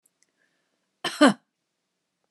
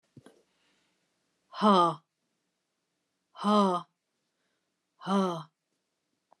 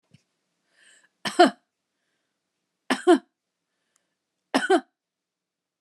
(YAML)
cough_length: 2.3 s
cough_amplitude: 24227
cough_signal_mean_std_ratio: 0.2
exhalation_length: 6.4 s
exhalation_amplitude: 10068
exhalation_signal_mean_std_ratio: 0.32
three_cough_length: 5.8 s
three_cough_amplitude: 26512
three_cough_signal_mean_std_ratio: 0.22
survey_phase: alpha (2021-03-01 to 2021-08-12)
age: 45-64
gender: Female
wearing_mask: 'No'
symptom_none: true
smoker_status: Ex-smoker
respiratory_condition_asthma: false
respiratory_condition_other: false
recruitment_source: REACT
submission_delay: 2 days
covid_test_result: Negative
covid_test_method: RT-qPCR